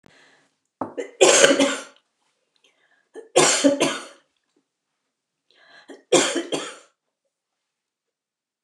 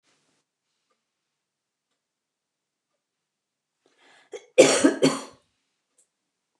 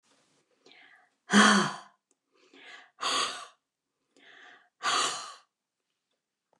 three_cough_length: 8.6 s
three_cough_amplitude: 29204
three_cough_signal_mean_std_ratio: 0.33
cough_length: 6.6 s
cough_amplitude: 27495
cough_signal_mean_std_ratio: 0.2
exhalation_length: 6.6 s
exhalation_amplitude: 12959
exhalation_signal_mean_std_ratio: 0.31
survey_phase: beta (2021-08-13 to 2022-03-07)
age: 65+
gender: Female
wearing_mask: 'No'
symptom_none: true
smoker_status: Ex-smoker
respiratory_condition_asthma: false
respiratory_condition_other: false
recruitment_source: REACT
submission_delay: 2 days
covid_test_result: Negative
covid_test_method: RT-qPCR
influenza_a_test_result: Negative
influenza_b_test_result: Negative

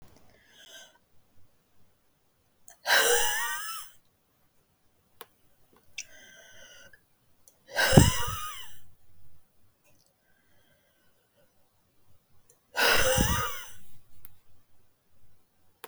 exhalation_length: 15.9 s
exhalation_amplitude: 32217
exhalation_signal_mean_std_ratio: 0.35
survey_phase: beta (2021-08-13 to 2022-03-07)
age: 45-64
gender: Female
wearing_mask: 'No'
symptom_none: true
smoker_status: Ex-smoker
respiratory_condition_asthma: true
respiratory_condition_other: true
recruitment_source: REACT
submission_delay: 2 days
covid_test_result: Negative
covid_test_method: RT-qPCR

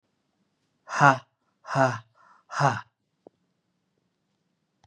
exhalation_length: 4.9 s
exhalation_amplitude: 25986
exhalation_signal_mean_std_ratio: 0.26
survey_phase: beta (2021-08-13 to 2022-03-07)
age: 18-44
gender: Male
wearing_mask: 'No'
symptom_cough_any: true
symptom_runny_or_blocked_nose: true
symptom_sore_throat: true
symptom_fatigue: true
symptom_fever_high_temperature: true
symptom_headache: true
symptom_onset: 3 days
smoker_status: Never smoked
respiratory_condition_asthma: false
respiratory_condition_other: false
recruitment_source: Test and Trace
submission_delay: 2 days
covid_test_result: Positive
covid_test_method: ePCR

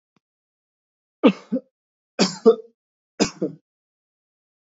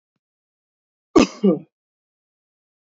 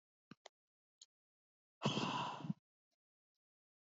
three_cough_length: 4.7 s
three_cough_amplitude: 26383
three_cough_signal_mean_std_ratio: 0.24
cough_length: 2.8 s
cough_amplitude: 27296
cough_signal_mean_std_ratio: 0.22
exhalation_length: 3.8 s
exhalation_amplitude: 2101
exhalation_signal_mean_std_ratio: 0.32
survey_phase: beta (2021-08-13 to 2022-03-07)
age: 18-44
gender: Male
wearing_mask: 'No'
symptom_none: true
smoker_status: Ex-smoker
respiratory_condition_asthma: false
respiratory_condition_other: false
recruitment_source: REACT
submission_delay: 1 day
covid_test_result: Negative
covid_test_method: RT-qPCR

